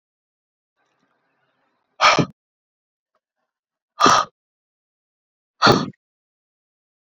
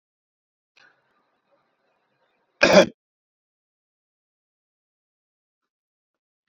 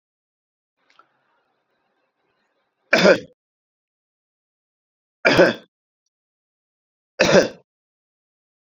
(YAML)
exhalation_length: 7.2 s
exhalation_amplitude: 30226
exhalation_signal_mean_std_ratio: 0.24
cough_length: 6.5 s
cough_amplitude: 27748
cough_signal_mean_std_ratio: 0.15
three_cough_length: 8.6 s
three_cough_amplitude: 30000
three_cough_signal_mean_std_ratio: 0.23
survey_phase: beta (2021-08-13 to 2022-03-07)
age: 45-64
gender: Male
wearing_mask: 'No'
symptom_cough_any: true
symptom_sore_throat: true
symptom_onset: 12 days
smoker_status: Never smoked
respiratory_condition_asthma: false
respiratory_condition_other: false
recruitment_source: REACT
submission_delay: 1 day
covid_test_result: Negative
covid_test_method: RT-qPCR
influenza_a_test_result: Negative
influenza_b_test_result: Negative